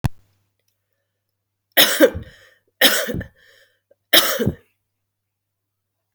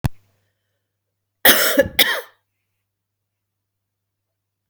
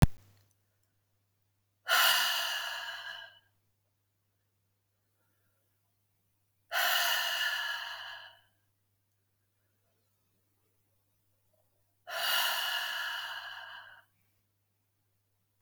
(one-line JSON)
{"three_cough_length": "6.1 s", "three_cough_amplitude": 32768, "three_cough_signal_mean_std_ratio": 0.31, "cough_length": "4.7 s", "cough_amplitude": 32768, "cough_signal_mean_std_ratio": 0.27, "exhalation_length": "15.6 s", "exhalation_amplitude": 15594, "exhalation_signal_mean_std_ratio": 0.38, "survey_phase": "beta (2021-08-13 to 2022-03-07)", "age": "45-64", "gender": "Female", "wearing_mask": "No", "symptom_none": true, "smoker_status": "Current smoker (1 to 10 cigarettes per day)", "respiratory_condition_asthma": false, "respiratory_condition_other": false, "recruitment_source": "REACT", "submission_delay": "3 days", "covid_test_result": "Negative", "covid_test_method": "RT-qPCR", "influenza_a_test_result": "Negative", "influenza_b_test_result": "Negative"}